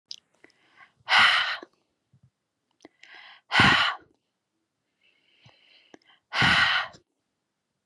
{"exhalation_length": "7.9 s", "exhalation_amplitude": 16275, "exhalation_signal_mean_std_ratio": 0.34, "survey_phase": "beta (2021-08-13 to 2022-03-07)", "age": "18-44", "gender": "Female", "wearing_mask": "No", "symptom_none": true, "smoker_status": "Never smoked", "respiratory_condition_asthma": false, "respiratory_condition_other": false, "recruitment_source": "REACT", "submission_delay": "4 days", "covid_test_result": "Negative", "covid_test_method": "RT-qPCR", "influenza_a_test_result": "Negative", "influenza_b_test_result": "Negative"}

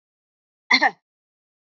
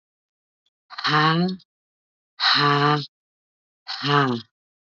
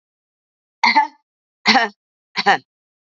{"cough_length": "1.6 s", "cough_amplitude": 22483, "cough_signal_mean_std_ratio": 0.25, "exhalation_length": "4.9 s", "exhalation_amplitude": 16770, "exhalation_signal_mean_std_ratio": 0.49, "three_cough_length": "3.2 s", "three_cough_amplitude": 32198, "three_cough_signal_mean_std_ratio": 0.34, "survey_phase": "beta (2021-08-13 to 2022-03-07)", "age": "45-64", "gender": "Female", "wearing_mask": "No", "symptom_none": true, "smoker_status": "Never smoked", "respiratory_condition_asthma": false, "respiratory_condition_other": false, "recruitment_source": "REACT", "submission_delay": "2 days", "covid_test_result": "Negative", "covid_test_method": "RT-qPCR", "influenza_a_test_result": "Negative", "influenza_b_test_result": "Negative"}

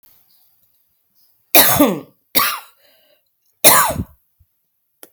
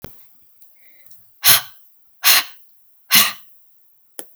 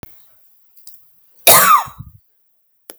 {"three_cough_length": "5.1 s", "three_cough_amplitude": 32768, "three_cough_signal_mean_std_ratio": 0.33, "exhalation_length": "4.4 s", "exhalation_amplitude": 32768, "exhalation_signal_mean_std_ratio": 0.32, "cough_length": "3.0 s", "cough_amplitude": 32768, "cough_signal_mean_std_ratio": 0.32, "survey_phase": "alpha (2021-03-01 to 2021-08-12)", "age": "18-44", "gender": "Female", "wearing_mask": "No", "symptom_none": true, "symptom_onset": "5 days", "smoker_status": "Ex-smoker", "respiratory_condition_asthma": true, "respiratory_condition_other": false, "recruitment_source": "REACT", "submission_delay": "2 days", "covid_test_result": "Negative", "covid_test_method": "RT-qPCR"}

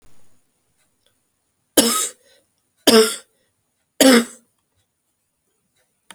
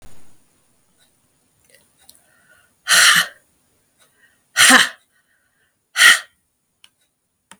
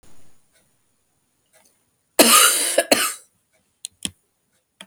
{"three_cough_length": "6.1 s", "three_cough_amplitude": 32768, "three_cough_signal_mean_std_ratio": 0.28, "exhalation_length": "7.6 s", "exhalation_amplitude": 32768, "exhalation_signal_mean_std_ratio": 0.28, "cough_length": "4.9 s", "cough_amplitude": 32768, "cough_signal_mean_std_ratio": 0.32, "survey_phase": "beta (2021-08-13 to 2022-03-07)", "age": "45-64", "gender": "Female", "wearing_mask": "No", "symptom_new_continuous_cough": true, "symptom_runny_or_blocked_nose": true, "symptom_sore_throat": true, "symptom_fatigue": true, "symptom_headache": true, "symptom_change_to_sense_of_smell_or_taste": true, "symptom_loss_of_taste": true, "symptom_onset": "4 days", "smoker_status": "Never smoked", "respiratory_condition_asthma": false, "respiratory_condition_other": false, "recruitment_source": "Test and Trace", "submission_delay": "2 days", "covid_test_result": "Positive", "covid_test_method": "RT-qPCR", "covid_ct_value": 17.8, "covid_ct_gene": "S gene", "covid_ct_mean": 18.3, "covid_viral_load": "990000 copies/ml", "covid_viral_load_category": "Low viral load (10K-1M copies/ml)"}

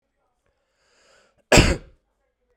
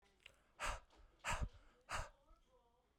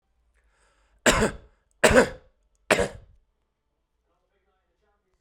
{"cough_length": "2.6 s", "cough_amplitude": 32768, "cough_signal_mean_std_ratio": 0.23, "exhalation_length": "3.0 s", "exhalation_amplitude": 1144, "exhalation_signal_mean_std_ratio": 0.42, "three_cough_length": "5.2 s", "three_cough_amplitude": 25410, "three_cough_signal_mean_std_ratio": 0.27, "survey_phase": "beta (2021-08-13 to 2022-03-07)", "age": "45-64", "gender": "Male", "wearing_mask": "No", "symptom_none": true, "smoker_status": "Current smoker (11 or more cigarettes per day)", "respiratory_condition_asthma": false, "respiratory_condition_other": false, "recruitment_source": "REACT", "submission_delay": "1 day", "covid_test_result": "Negative", "covid_test_method": "RT-qPCR"}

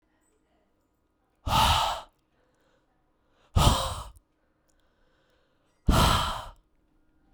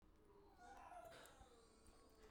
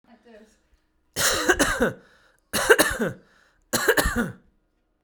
{"exhalation_length": "7.3 s", "exhalation_amplitude": 15284, "exhalation_signal_mean_std_ratio": 0.35, "cough_length": "2.3 s", "cough_amplitude": 123, "cough_signal_mean_std_ratio": 1.0, "three_cough_length": "5.0 s", "three_cough_amplitude": 30215, "three_cough_signal_mean_std_ratio": 0.45, "survey_phase": "beta (2021-08-13 to 2022-03-07)", "age": "18-44", "gender": "Male", "wearing_mask": "No", "symptom_none": true, "smoker_status": "Ex-smoker", "respiratory_condition_asthma": false, "respiratory_condition_other": false, "recruitment_source": "REACT", "submission_delay": "1 day", "covid_test_result": "Negative", "covid_test_method": "RT-qPCR"}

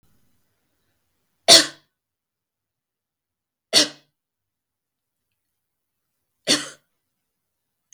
{"three_cough_length": "7.9 s", "three_cough_amplitude": 32768, "three_cough_signal_mean_std_ratio": 0.17, "survey_phase": "beta (2021-08-13 to 2022-03-07)", "age": "18-44", "gender": "Male", "wearing_mask": "No", "symptom_runny_or_blocked_nose": true, "symptom_onset": "71 days", "smoker_status": "Never smoked", "respiratory_condition_asthma": false, "respiratory_condition_other": false, "recruitment_source": "Test and Trace", "submission_delay": "68 days", "covid_test_method": "RT-qPCR"}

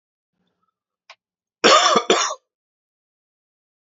{"cough_length": "3.8 s", "cough_amplitude": 29523, "cough_signal_mean_std_ratio": 0.3, "survey_phase": "alpha (2021-03-01 to 2021-08-12)", "age": "45-64", "gender": "Male", "wearing_mask": "No", "symptom_fatigue": true, "symptom_headache": true, "symptom_change_to_sense_of_smell_or_taste": true, "smoker_status": "Ex-smoker", "respiratory_condition_asthma": false, "respiratory_condition_other": false, "recruitment_source": "Test and Trace", "submission_delay": "2 days", "covid_test_result": "Positive", "covid_test_method": "RT-qPCR", "covid_ct_value": 16.1, "covid_ct_gene": "ORF1ab gene", "covid_ct_mean": 16.5, "covid_viral_load": "3700000 copies/ml", "covid_viral_load_category": "High viral load (>1M copies/ml)"}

